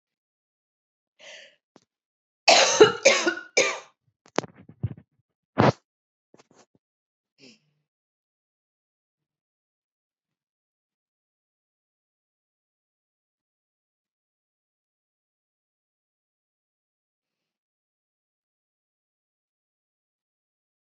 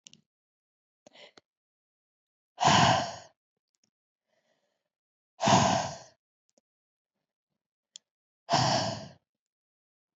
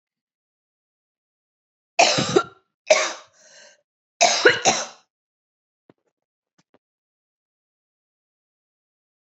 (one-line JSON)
{"cough_length": "20.8 s", "cough_amplitude": 27370, "cough_signal_mean_std_ratio": 0.17, "exhalation_length": "10.2 s", "exhalation_amplitude": 12212, "exhalation_signal_mean_std_ratio": 0.3, "three_cough_length": "9.3 s", "three_cough_amplitude": 27563, "three_cough_signal_mean_std_ratio": 0.26, "survey_phase": "beta (2021-08-13 to 2022-03-07)", "age": "18-44", "gender": "Female", "wearing_mask": "No", "symptom_runny_or_blocked_nose": true, "smoker_status": "Never smoked", "respiratory_condition_asthma": false, "respiratory_condition_other": false, "recruitment_source": "Test and Trace", "submission_delay": "1 day", "covid_test_result": "Positive", "covid_test_method": "ePCR"}